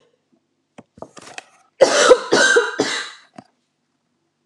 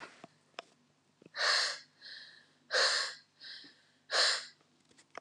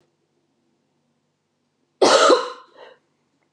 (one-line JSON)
{"three_cough_length": "4.5 s", "three_cough_amplitude": 32768, "three_cough_signal_mean_std_ratio": 0.37, "exhalation_length": "5.2 s", "exhalation_amplitude": 5343, "exhalation_signal_mean_std_ratio": 0.42, "cough_length": "3.5 s", "cough_amplitude": 28913, "cough_signal_mean_std_ratio": 0.29, "survey_phase": "beta (2021-08-13 to 2022-03-07)", "age": "18-44", "gender": "Female", "wearing_mask": "No", "symptom_cough_any": true, "symptom_new_continuous_cough": true, "symptom_runny_or_blocked_nose": true, "symptom_change_to_sense_of_smell_or_taste": true, "symptom_loss_of_taste": true, "symptom_other": true, "smoker_status": "Never smoked", "respiratory_condition_asthma": false, "respiratory_condition_other": false, "recruitment_source": "Test and Trace", "submission_delay": "2 days", "covid_test_result": "Positive", "covid_test_method": "RT-qPCR", "covid_ct_value": 16.5, "covid_ct_gene": "ORF1ab gene", "covid_ct_mean": 17.0, "covid_viral_load": "2700000 copies/ml", "covid_viral_load_category": "High viral load (>1M copies/ml)"}